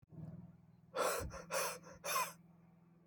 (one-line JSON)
{"exhalation_length": "3.1 s", "exhalation_amplitude": 1993, "exhalation_signal_mean_std_ratio": 0.57, "survey_phase": "alpha (2021-03-01 to 2021-08-12)", "age": "18-44", "gender": "Male", "wearing_mask": "No", "symptom_cough_any": true, "symptom_new_continuous_cough": true, "symptom_fever_high_temperature": true, "symptom_change_to_sense_of_smell_or_taste": true, "smoker_status": "Never smoked", "respiratory_condition_asthma": false, "respiratory_condition_other": false, "recruitment_source": "Test and Trace", "submission_delay": "2 days", "covid_test_result": "Positive", "covid_test_method": "RT-qPCR", "covid_ct_value": 18.4, "covid_ct_gene": "ORF1ab gene"}